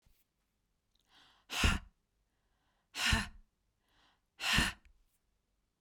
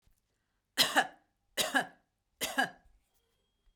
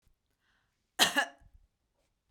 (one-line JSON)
{"exhalation_length": "5.8 s", "exhalation_amplitude": 4967, "exhalation_signal_mean_std_ratio": 0.31, "three_cough_length": "3.8 s", "three_cough_amplitude": 9161, "three_cough_signal_mean_std_ratio": 0.32, "cough_length": "2.3 s", "cough_amplitude": 11492, "cough_signal_mean_std_ratio": 0.24, "survey_phase": "beta (2021-08-13 to 2022-03-07)", "age": "45-64", "gender": "Female", "wearing_mask": "No", "symptom_none": true, "smoker_status": "Never smoked", "respiratory_condition_asthma": false, "respiratory_condition_other": false, "recruitment_source": "REACT", "submission_delay": "1 day", "covid_test_result": "Negative", "covid_test_method": "RT-qPCR", "influenza_a_test_result": "Negative", "influenza_b_test_result": "Negative"}